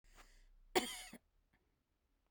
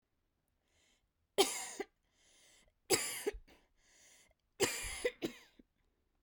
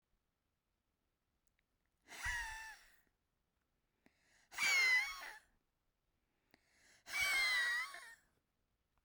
cough_length: 2.3 s
cough_amplitude: 4068
cough_signal_mean_std_ratio: 0.26
three_cough_length: 6.2 s
three_cough_amplitude: 6304
three_cough_signal_mean_std_ratio: 0.32
exhalation_length: 9.0 s
exhalation_amplitude: 2067
exhalation_signal_mean_std_ratio: 0.39
survey_phase: beta (2021-08-13 to 2022-03-07)
age: 45-64
gender: Female
wearing_mask: 'No'
symptom_none: true
smoker_status: Ex-smoker
respiratory_condition_asthma: true
respiratory_condition_other: false
recruitment_source: REACT
submission_delay: 1 day
covid_test_result: Negative
covid_test_method: RT-qPCR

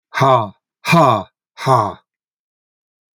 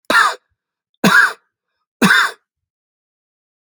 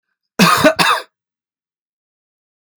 exhalation_length: 3.2 s
exhalation_amplitude: 31595
exhalation_signal_mean_std_ratio: 0.43
three_cough_length: 3.7 s
three_cough_amplitude: 30569
three_cough_signal_mean_std_ratio: 0.38
cough_length: 2.8 s
cough_amplitude: 31323
cough_signal_mean_std_ratio: 0.36
survey_phase: alpha (2021-03-01 to 2021-08-12)
age: 65+
gender: Male
wearing_mask: 'No'
symptom_none: true
smoker_status: Never smoked
respiratory_condition_asthma: false
respiratory_condition_other: false
recruitment_source: REACT
submission_delay: 1 day
covid_test_result: Negative
covid_test_method: RT-qPCR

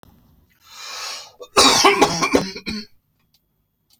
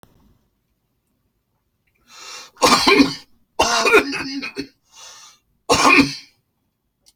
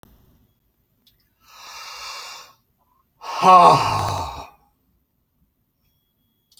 cough_length: 4.0 s
cough_amplitude: 32540
cough_signal_mean_std_ratio: 0.41
three_cough_length: 7.2 s
three_cough_amplitude: 32768
three_cough_signal_mean_std_ratio: 0.39
exhalation_length: 6.6 s
exhalation_amplitude: 31759
exhalation_signal_mean_std_ratio: 0.29
survey_phase: beta (2021-08-13 to 2022-03-07)
age: 65+
gender: Male
wearing_mask: 'No'
symptom_none: true
smoker_status: Current smoker (e-cigarettes or vapes only)
respiratory_condition_asthma: false
respiratory_condition_other: false
recruitment_source: REACT
submission_delay: 1 day
covid_test_result: Negative
covid_test_method: RT-qPCR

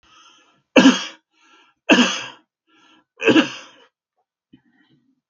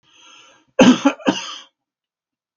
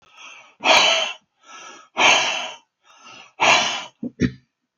three_cough_length: 5.3 s
three_cough_amplitude: 32768
three_cough_signal_mean_std_ratio: 0.3
cough_length: 2.6 s
cough_amplitude: 32768
cough_signal_mean_std_ratio: 0.31
exhalation_length: 4.8 s
exhalation_amplitude: 30796
exhalation_signal_mean_std_ratio: 0.47
survey_phase: beta (2021-08-13 to 2022-03-07)
age: 65+
gender: Male
wearing_mask: 'No'
symptom_none: true
smoker_status: Ex-smoker
respiratory_condition_asthma: false
respiratory_condition_other: false
recruitment_source: REACT
submission_delay: 1 day
covid_test_result: Negative
covid_test_method: RT-qPCR
influenza_a_test_result: Negative
influenza_b_test_result: Negative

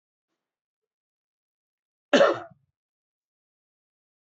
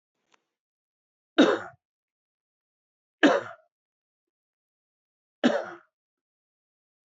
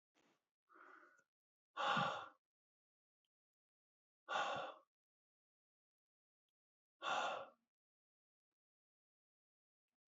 cough_length: 4.4 s
cough_amplitude: 17505
cough_signal_mean_std_ratio: 0.18
three_cough_length: 7.2 s
three_cough_amplitude: 18620
three_cough_signal_mean_std_ratio: 0.21
exhalation_length: 10.2 s
exhalation_amplitude: 1683
exhalation_signal_mean_std_ratio: 0.29
survey_phase: beta (2021-08-13 to 2022-03-07)
age: 45-64
gender: Male
wearing_mask: 'No'
symptom_cough_any: true
symptom_runny_or_blocked_nose: true
smoker_status: Current smoker (11 or more cigarettes per day)
respiratory_condition_asthma: false
respiratory_condition_other: false
recruitment_source: Test and Trace
submission_delay: 2 days
covid_test_result: Negative
covid_test_method: LFT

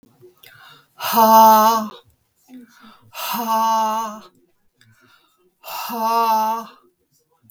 exhalation_length: 7.5 s
exhalation_amplitude: 32084
exhalation_signal_mean_std_ratio: 0.47
survey_phase: beta (2021-08-13 to 2022-03-07)
age: 65+
gender: Female
wearing_mask: 'No'
symptom_none: true
symptom_onset: 8 days
smoker_status: Ex-smoker
respiratory_condition_asthma: false
respiratory_condition_other: false
recruitment_source: REACT
submission_delay: 1 day
covid_test_result: Negative
covid_test_method: RT-qPCR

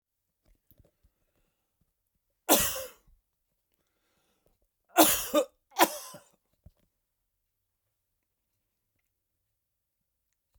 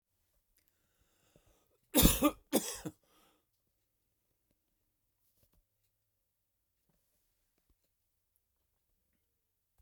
three_cough_length: 10.6 s
three_cough_amplitude: 20079
three_cough_signal_mean_std_ratio: 0.21
cough_length: 9.8 s
cough_amplitude: 10447
cough_signal_mean_std_ratio: 0.17
survey_phase: beta (2021-08-13 to 2022-03-07)
age: 65+
gender: Male
wearing_mask: 'No'
symptom_cough_any: true
smoker_status: Ex-smoker
respiratory_condition_asthma: false
respiratory_condition_other: false
recruitment_source: REACT
submission_delay: 5 days
covid_test_result: Negative
covid_test_method: RT-qPCR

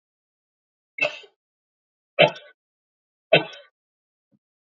three_cough_length: 4.8 s
three_cough_amplitude: 26305
three_cough_signal_mean_std_ratio: 0.19
survey_phase: beta (2021-08-13 to 2022-03-07)
age: 45-64
gender: Male
wearing_mask: 'No'
symptom_none: true
smoker_status: Never smoked
respiratory_condition_asthma: false
respiratory_condition_other: false
recruitment_source: REACT
submission_delay: 2 days
covid_test_result: Negative
covid_test_method: RT-qPCR
influenza_a_test_result: Unknown/Void
influenza_b_test_result: Unknown/Void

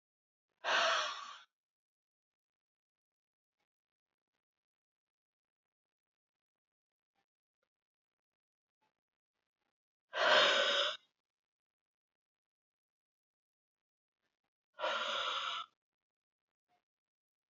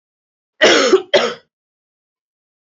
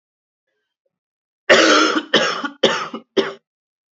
exhalation_length: 17.5 s
exhalation_amplitude: 5624
exhalation_signal_mean_std_ratio: 0.26
three_cough_length: 2.6 s
three_cough_amplitude: 28958
three_cough_signal_mean_std_ratio: 0.37
cough_length: 3.9 s
cough_amplitude: 32767
cough_signal_mean_std_ratio: 0.43
survey_phase: beta (2021-08-13 to 2022-03-07)
age: 18-44
gender: Female
wearing_mask: 'No'
symptom_cough_any: true
symptom_runny_or_blocked_nose: true
symptom_fatigue: true
symptom_change_to_sense_of_smell_or_taste: true
symptom_loss_of_taste: true
symptom_other: true
symptom_onset: 6 days
smoker_status: Ex-smoker
respiratory_condition_asthma: false
respiratory_condition_other: false
recruitment_source: Test and Trace
submission_delay: 2 days
covid_test_result: Positive
covid_test_method: RT-qPCR
covid_ct_value: 24.6
covid_ct_gene: ORF1ab gene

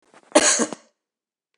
cough_length: 1.6 s
cough_amplitude: 25962
cough_signal_mean_std_ratio: 0.34
survey_phase: beta (2021-08-13 to 2022-03-07)
age: 65+
gender: Female
wearing_mask: 'No'
symptom_none: true
smoker_status: Never smoked
respiratory_condition_asthma: false
respiratory_condition_other: false
recruitment_source: REACT
submission_delay: 2 days
covid_test_result: Negative
covid_test_method: RT-qPCR
influenza_a_test_result: Negative
influenza_b_test_result: Negative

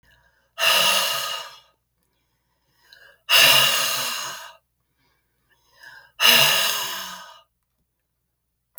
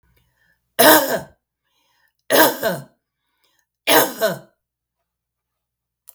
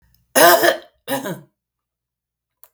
exhalation_length: 8.8 s
exhalation_amplitude: 32441
exhalation_signal_mean_std_ratio: 0.43
three_cough_length: 6.1 s
three_cough_amplitude: 32768
three_cough_signal_mean_std_ratio: 0.33
cough_length: 2.7 s
cough_amplitude: 32768
cough_signal_mean_std_ratio: 0.35
survey_phase: beta (2021-08-13 to 2022-03-07)
age: 65+
gender: Female
wearing_mask: 'No'
symptom_none: true
smoker_status: Never smoked
respiratory_condition_asthma: false
respiratory_condition_other: false
recruitment_source: REACT
submission_delay: 2 days
covid_test_result: Negative
covid_test_method: RT-qPCR
influenza_a_test_result: Negative
influenza_b_test_result: Negative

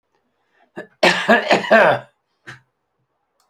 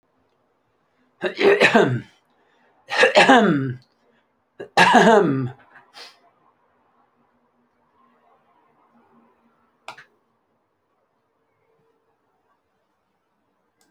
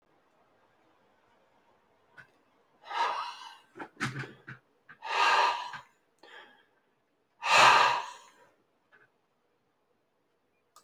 cough_length: 3.5 s
cough_amplitude: 30849
cough_signal_mean_std_ratio: 0.39
three_cough_length: 13.9 s
three_cough_amplitude: 28849
three_cough_signal_mean_std_ratio: 0.3
exhalation_length: 10.8 s
exhalation_amplitude: 12713
exhalation_signal_mean_std_ratio: 0.31
survey_phase: beta (2021-08-13 to 2022-03-07)
age: 65+
gender: Male
wearing_mask: 'No'
symptom_none: true
smoker_status: Never smoked
recruitment_source: REACT
submission_delay: 2 days
covid_test_result: Negative
covid_test_method: RT-qPCR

